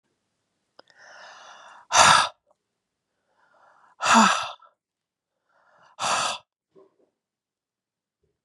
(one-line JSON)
{"exhalation_length": "8.4 s", "exhalation_amplitude": 28273, "exhalation_signal_mean_std_ratio": 0.28, "survey_phase": "beta (2021-08-13 to 2022-03-07)", "age": "65+", "gender": "Female", "wearing_mask": "No", "symptom_cough_any": true, "symptom_runny_or_blocked_nose": true, "symptom_fatigue": true, "symptom_loss_of_taste": true, "symptom_onset": "2 days", "smoker_status": "Never smoked", "respiratory_condition_asthma": false, "respiratory_condition_other": false, "recruitment_source": "Test and Trace", "submission_delay": "1 day", "covid_test_result": "Positive", "covid_test_method": "RT-qPCR"}